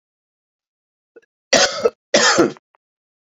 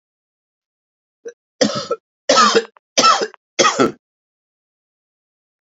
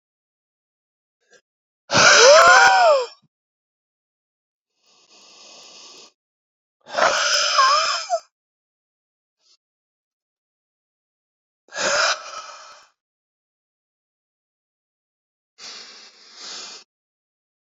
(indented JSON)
{
  "cough_length": "3.3 s",
  "cough_amplitude": 32594,
  "cough_signal_mean_std_ratio": 0.35,
  "three_cough_length": "5.6 s",
  "three_cough_amplitude": 32767,
  "three_cough_signal_mean_std_ratio": 0.36,
  "exhalation_length": "17.7 s",
  "exhalation_amplitude": 32767,
  "exhalation_signal_mean_std_ratio": 0.31,
  "survey_phase": "beta (2021-08-13 to 2022-03-07)",
  "age": "45-64",
  "gender": "Male",
  "wearing_mask": "No",
  "symptom_cough_any": true,
  "symptom_sore_throat": true,
  "symptom_headache": true,
  "symptom_onset": "3 days",
  "smoker_status": "Ex-smoker",
  "respiratory_condition_asthma": false,
  "respiratory_condition_other": false,
  "recruitment_source": "Test and Trace",
  "submission_delay": "1 day",
  "covid_test_result": "Positive",
  "covid_test_method": "RT-qPCR",
  "covid_ct_value": 22.2,
  "covid_ct_gene": "ORF1ab gene",
  "covid_ct_mean": 22.5,
  "covid_viral_load": "43000 copies/ml",
  "covid_viral_load_category": "Low viral load (10K-1M copies/ml)"
}